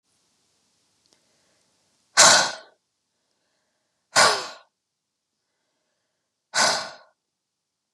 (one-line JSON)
{"exhalation_length": "7.9 s", "exhalation_amplitude": 32342, "exhalation_signal_mean_std_ratio": 0.25, "survey_phase": "beta (2021-08-13 to 2022-03-07)", "age": "45-64", "gender": "Female", "wearing_mask": "No", "symptom_none": true, "smoker_status": "Never smoked", "respiratory_condition_asthma": false, "respiratory_condition_other": false, "recruitment_source": "REACT", "submission_delay": "2 days", "covid_test_result": "Negative", "covid_test_method": "RT-qPCR", "influenza_a_test_result": "Negative", "influenza_b_test_result": "Negative"}